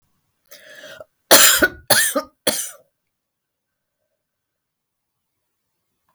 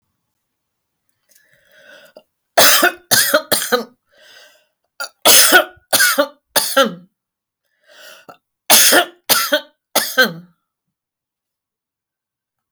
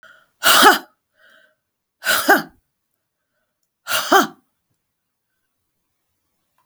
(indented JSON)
{
  "cough_length": "6.1 s",
  "cough_amplitude": 32768,
  "cough_signal_mean_std_ratio": 0.27,
  "three_cough_length": "12.7 s",
  "three_cough_amplitude": 32768,
  "three_cough_signal_mean_std_ratio": 0.37,
  "exhalation_length": "6.7 s",
  "exhalation_amplitude": 32768,
  "exhalation_signal_mean_std_ratio": 0.3,
  "survey_phase": "beta (2021-08-13 to 2022-03-07)",
  "age": "65+",
  "gender": "Female",
  "wearing_mask": "No",
  "symptom_none": true,
  "smoker_status": "Never smoked",
  "respiratory_condition_asthma": false,
  "respiratory_condition_other": false,
  "recruitment_source": "REACT",
  "submission_delay": "2 days",
  "covid_test_result": "Negative",
  "covid_test_method": "RT-qPCR"
}